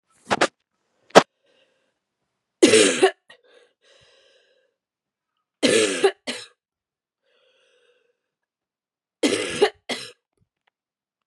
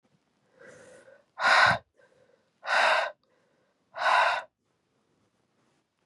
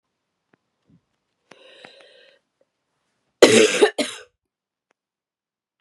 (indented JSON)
{
  "three_cough_length": "11.3 s",
  "three_cough_amplitude": 32768,
  "three_cough_signal_mean_std_ratio": 0.27,
  "exhalation_length": "6.1 s",
  "exhalation_amplitude": 14563,
  "exhalation_signal_mean_std_ratio": 0.37,
  "cough_length": "5.8 s",
  "cough_amplitude": 32768,
  "cough_signal_mean_std_ratio": 0.22,
  "survey_phase": "beta (2021-08-13 to 2022-03-07)",
  "age": "18-44",
  "gender": "Female",
  "wearing_mask": "No",
  "symptom_cough_any": true,
  "symptom_new_continuous_cough": true,
  "symptom_runny_or_blocked_nose": true,
  "symptom_sore_throat": true,
  "symptom_fatigue": true,
  "symptom_fever_high_temperature": true,
  "symptom_headache": true,
  "symptom_change_to_sense_of_smell_or_taste": true,
  "symptom_loss_of_taste": true,
  "symptom_onset": "2 days",
  "smoker_status": "Never smoked",
  "respiratory_condition_asthma": false,
  "respiratory_condition_other": false,
  "recruitment_source": "Test and Trace",
  "submission_delay": "1 day",
  "covid_test_result": "Positive",
  "covid_test_method": "ePCR"
}